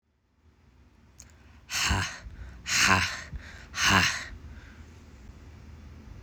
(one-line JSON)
{"exhalation_length": "6.2 s", "exhalation_amplitude": 16101, "exhalation_signal_mean_std_ratio": 0.45, "survey_phase": "alpha (2021-03-01 to 2021-08-12)", "age": "18-44", "gender": "Male", "wearing_mask": "No", "symptom_cough_any": true, "symptom_new_continuous_cough": true, "symptom_fever_high_temperature": true, "symptom_headache": true, "symptom_onset": "4 days", "smoker_status": "Never smoked", "respiratory_condition_asthma": false, "respiratory_condition_other": false, "recruitment_source": "Test and Trace", "submission_delay": "1 day", "covid_test_result": "Positive", "covid_test_method": "RT-qPCR", "covid_ct_value": 29.8, "covid_ct_gene": "N gene"}